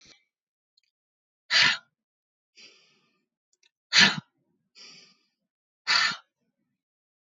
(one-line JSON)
{"exhalation_length": "7.3 s", "exhalation_amplitude": 21850, "exhalation_signal_mean_std_ratio": 0.24, "survey_phase": "beta (2021-08-13 to 2022-03-07)", "age": "65+", "gender": "Female", "wearing_mask": "No", "symptom_none": true, "smoker_status": "Never smoked", "respiratory_condition_asthma": false, "respiratory_condition_other": false, "recruitment_source": "REACT", "submission_delay": "6 days", "covid_test_result": "Negative", "covid_test_method": "RT-qPCR"}